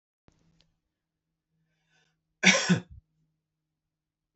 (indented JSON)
{
  "cough_length": "4.4 s",
  "cough_amplitude": 20337,
  "cough_signal_mean_std_ratio": 0.21,
  "survey_phase": "beta (2021-08-13 to 2022-03-07)",
  "age": "18-44",
  "gender": "Male",
  "wearing_mask": "No",
  "symptom_runny_or_blocked_nose": true,
  "symptom_loss_of_taste": true,
  "smoker_status": "Never smoked",
  "respiratory_condition_asthma": false,
  "respiratory_condition_other": false,
  "recruitment_source": "Test and Trace",
  "submission_delay": "2 days",
  "covid_test_result": "Positive",
  "covid_test_method": "RT-qPCR",
  "covid_ct_value": 18.9,
  "covid_ct_gene": "ORF1ab gene",
  "covid_ct_mean": 20.4,
  "covid_viral_load": "200000 copies/ml",
  "covid_viral_load_category": "Low viral load (10K-1M copies/ml)"
}